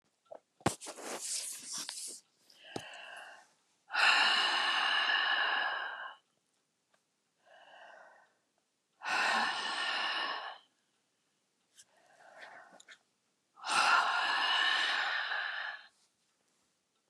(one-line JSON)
{"exhalation_length": "17.1 s", "exhalation_amplitude": 6144, "exhalation_signal_mean_std_ratio": 0.54, "survey_phase": "beta (2021-08-13 to 2022-03-07)", "age": "45-64", "gender": "Female", "wearing_mask": "No", "symptom_none": true, "smoker_status": "Never smoked", "respiratory_condition_asthma": false, "respiratory_condition_other": false, "recruitment_source": "REACT", "submission_delay": "3 days", "covid_test_result": "Negative", "covid_test_method": "RT-qPCR", "influenza_a_test_result": "Negative", "influenza_b_test_result": "Negative"}